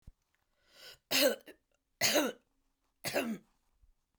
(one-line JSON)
{"three_cough_length": "4.2 s", "three_cough_amplitude": 6039, "three_cough_signal_mean_std_ratio": 0.36, "survey_phase": "beta (2021-08-13 to 2022-03-07)", "age": "65+", "gender": "Female", "wearing_mask": "No", "symptom_none": true, "smoker_status": "Never smoked", "respiratory_condition_asthma": false, "respiratory_condition_other": false, "recruitment_source": "REACT", "submission_delay": "2 days", "covid_test_result": "Negative", "covid_test_method": "RT-qPCR"}